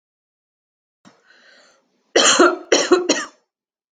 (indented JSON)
{
  "cough_length": "3.9 s",
  "cough_amplitude": 28162,
  "cough_signal_mean_std_ratio": 0.36,
  "survey_phase": "alpha (2021-03-01 to 2021-08-12)",
  "age": "18-44",
  "gender": "Female",
  "wearing_mask": "No",
  "symptom_none": true,
  "smoker_status": "Never smoked",
  "respiratory_condition_asthma": false,
  "respiratory_condition_other": false,
  "recruitment_source": "REACT",
  "submission_delay": "2 days",
  "covid_test_result": "Negative",
  "covid_test_method": "RT-qPCR"
}